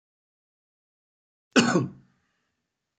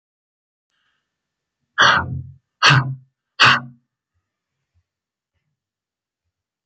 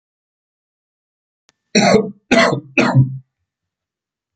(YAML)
cough_length: 3.0 s
cough_amplitude: 19649
cough_signal_mean_std_ratio: 0.25
exhalation_length: 6.7 s
exhalation_amplitude: 30890
exhalation_signal_mean_std_ratio: 0.28
three_cough_length: 4.4 s
three_cough_amplitude: 32768
three_cough_signal_mean_std_ratio: 0.38
survey_phase: beta (2021-08-13 to 2022-03-07)
age: 65+
gender: Male
wearing_mask: 'No'
symptom_none: true
smoker_status: Ex-smoker
respiratory_condition_asthma: false
respiratory_condition_other: false
recruitment_source: REACT
submission_delay: 1 day
covid_test_result: Negative
covid_test_method: RT-qPCR
influenza_a_test_result: Negative
influenza_b_test_result: Negative